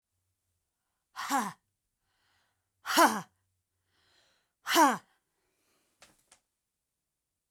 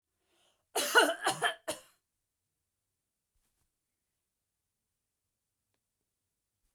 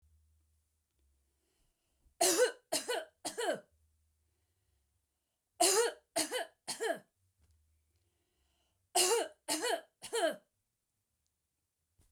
{"exhalation_length": "7.5 s", "exhalation_amplitude": 10135, "exhalation_signal_mean_std_ratio": 0.25, "cough_length": "6.7 s", "cough_amplitude": 9186, "cough_signal_mean_std_ratio": 0.23, "three_cough_length": "12.1 s", "three_cough_amplitude": 6242, "three_cough_signal_mean_std_ratio": 0.35, "survey_phase": "beta (2021-08-13 to 2022-03-07)", "age": "45-64", "gender": "Female", "wearing_mask": "No", "symptom_none": true, "smoker_status": "Never smoked", "respiratory_condition_asthma": false, "respiratory_condition_other": false, "recruitment_source": "REACT", "submission_delay": "1 day", "covid_test_result": "Negative", "covid_test_method": "RT-qPCR", "influenza_a_test_result": "Negative", "influenza_b_test_result": "Negative"}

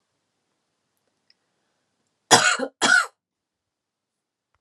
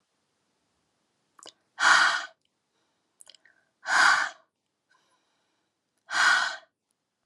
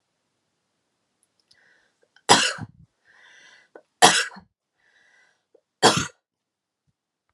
{"cough_length": "4.6 s", "cough_amplitude": 32293, "cough_signal_mean_std_ratio": 0.26, "exhalation_length": "7.3 s", "exhalation_amplitude": 15031, "exhalation_signal_mean_std_ratio": 0.33, "three_cough_length": "7.3 s", "three_cough_amplitude": 32617, "three_cough_signal_mean_std_ratio": 0.22, "survey_phase": "alpha (2021-03-01 to 2021-08-12)", "age": "18-44", "gender": "Female", "wearing_mask": "No", "symptom_cough_any": true, "symptom_headache": true, "smoker_status": "Never smoked", "respiratory_condition_asthma": false, "respiratory_condition_other": false, "recruitment_source": "Test and Trace", "submission_delay": "2 days", "covid_test_result": "Positive", "covid_test_method": "RT-qPCR", "covid_ct_value": 22.3, "covid_ct_gene": "N gene"}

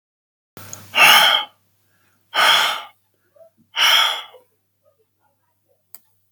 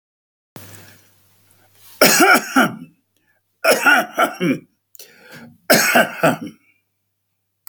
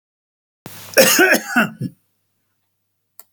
{"exhalation_length": "6.3 s", "exhalation_amplitude": 32767, "exhalation_signal_mean_std_ratio": 0.38, "three_cough_length": "7.7 s", "three_cough_amplitude": 32768, "three_cough_signal_mean_std_ratio": 0.41, "cough_length": "3.3 s", "cough_amplitude": 32768, "cough_signal_mean_std_ratio": 0.37, "survey_phase": "beta (2021-08-13 to 2022-03-07)", "age": "65+", "gender": "Male", "wearing_mask": "No", "symptom_none": true, "smoker_status": "Ex-smoker", "respiratory_condition_asthma": false, "respiratory_condition_other": false, "recruitment_source": "REACT", "submission_delay": "2 days", "covid_test_result": "Negative", "covid_test_method": "RT-qPCR", "influenza_a_test_result": "Negative", "influenza_b_test_result": "Negative"}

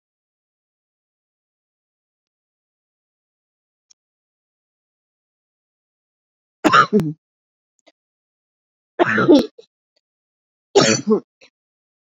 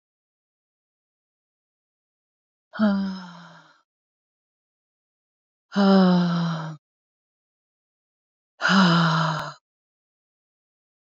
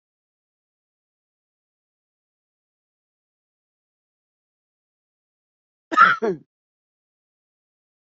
{"three_cough_length": "12.1 s", "three_cough_amplitude": 32767, "three_cough_signal_mean_std_ratio": 0.23, "exhalation_length": "11.0 s", "exhalation_amplitude": 17080, "exhalation_signal_mean_std_ratio": 0.36, "cough_length": "8.2 s", "cough_amplitude": 27571, "cough_signal_mean_std_ratio": 0.15, "survey_phase": "beta (2021-08-13 to 2022-03-07)", "age": "45-64", "gender": "Female", "wearing_mask": "No", "symptom_cough_any": true, "symptom_fatigue": true, "symptom_change_to_sense_of_smell_or_taste": true, "symptom_onset": "11 days", "smoker_status": "Current smoker (1 to 10 cigarettes per day)", "respiratory_condition_asthma": false, "respiratory_condition_other": false, "recruitment_source": "REACT", "submission_delay": "2 days", "covid_test_result": "Negative", "covid_test_method": "RT-qPCR"}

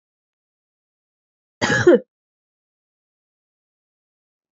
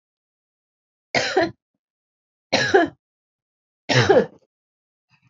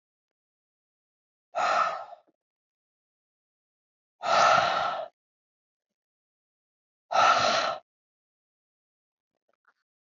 {"cough_length": "4.5 s", "cough_amplitude": 25776, "cough_signal_mean_std_ratio": 0.2, "three_cough_length": "5.3 s", "three_cough_amplitude": 26683, "three_cough_signal_mean_std_ratio": 0.33, "exhalation_length": "10.1 s", "exhalation_amplitude": 11464, "exhalation_signal_mean_std_ratio": 0.34, "survey_phase": "alpha (2021-03-01 to 2021-08-12)", "age": "45-64", "gender": "Female", "wearing_mask": "No", "symptom_fatigue": true, "symptom_change_to_sense_of_smell_or_taste": true, "symptom_loss_of_taste": true, "symptom_onset": "6 days", "smoker_status": "Ex-smoker", "respiratory_condition_asthma": false, "respiratory_condition_other": false, "recruitment_source": "Test and Trace", "submission_delay": "2 days", "covid_test_result": "Positive", "covid_test_method": "RT-qPCR", "covid_ct_value": 31.9, "covid_ct_gene": "N gene", "covid_ct_mean": 32.0, "covid_viral_load": "32 copies/ml", "covid_viral_load_category": "Minimal viral load (< 10K copies/ml)"}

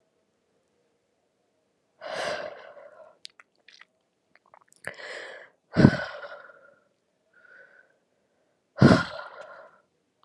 {"exhalation_length": "10.2 s", "exhalation_amplitude": 31278, "exhalation_signal_mean_std_ratio": 0.22, "survey_phase": "alpha (2021-03-01 to 2021-08-12)", "age": "18-44", "gender": "Female", "wearing_mask": "No", "symptom_cough_any": true, "symptom_shortness_of_breath": true, "symptom_fatigue": true, "symptom_change_to_sense_of_smell_or_taste": true, "symptom_loss_of_taste": true, "symptom_onset": "2 days", "smoker_status": "Ex-smoker", "respiratory_condition_asthma": false, "respiratory_condition_other": false, "recruitment_source": "Test and Trace", "submission_delay": "2 days", "covid_test_result": "Positive", "covid_test_method": "RT-qPCR", "covid_ct_value": 27.0, "covid_ct_gene": "ORF1ab gene", "covid_ct_mean": 27.4, "covid_viral_load": "990 copies/ml", "covid_viral_load_category": "Minimal viral load (< 10K copies/ml)"}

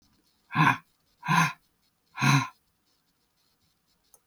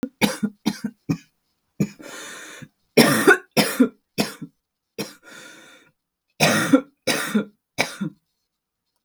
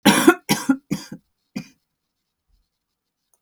{"exhalation_length": "4.3 s", "exhalation_amplitude": 13813, "exhalation_signal_mean_std_ratio": 0.33, "three_cough_length": "9.0 s", "three_cough_amplitude": 32768, "three_cough_signal_mean_std_ratio": 0.38, "cough_length": "3.4 s", "cough_amplitude": 32768, "cough_signal_mean_std_ratio": 0.29, "survey_phase": "beta (2021-08-13 to 2022-03-07)", "age": "45-64", "gender": "Female", "wearing_mask": "No", "symptom_cough_any": true, "symptom_runny_or_blocked_nose": true, "symptom_shortness_of_breath": true, "symptom_sore_throat": true, "symptom_fatigue": true, "symptom_headache": true, "symptom_onset": "5 days", "smoker_status": "Ex-smoker", "respiratory_condition_asthma": false, "respiratory_condition_other": false, "recruitment_source": "Test and Trace", "submission_delay": "2 days", "covid_test_result": "Positive", "covid_test_method": "RT-qPCR", "covid_ct_value": 21.7, "covid_ct_gene": "ORF1ab gene", "covid_ct_mean": 22.1, "covid_viral_load": "56000 copies/ml", "covid_viral_load_category": "Low viral load (10K-1M copies/ml)"}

